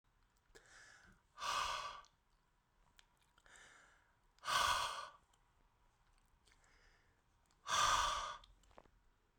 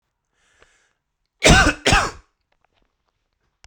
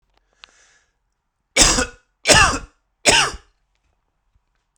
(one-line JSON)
{"exhalation_length": "9.4 s", "exhalation_amplitude": 2281, "exhalation_signal_mean_std_ratio": 0.37, "cough_length": "3.7 s", "cough_amplitude": 32768, "cough_signal_mean_std_ratio": 0.29, "three_cough_length": "4.8 s", "three_cough_amplitude": 32768, "three_cough_signal_mean_std_ratio": 0.33, "survey_phase": "beta (2021-08-13 to 2022-03-07)", "age": "18-44", "gender": "Male", "wearing_mask": "No", "symptom_cough_any": true, "symptom_runny_or_blocked_nose": true, "symptom_shortness_of_breath": true, "symptom_sore_throat": true, "symptom_abdominal_pain": true, "symptom_diarrhoea": true, "symptom_fatigue": true, "symptom_headache": true, "symptom_change_to_sense_of_smell_or_taste": true, "symptom_loss_of_taste": true, "smoker_status": "Ex-smoker", "respiratory_condition_asthma": false, "respiratory_condition_other": false, "recruitment_source": "Test and Trace", "submission_delay": "2 days", "covid_test_result": "Positive", "covid_test_method": "RT-qPCR", "covid_ct_value": 16.1, "covid_ct_gene": "ORF1ab gene", "covid_ct_mean": 16.4, "covid_viral_load": "4100000 copies/ml", "covid_viral_load_category": "High viral load (>1M copies/ml)"}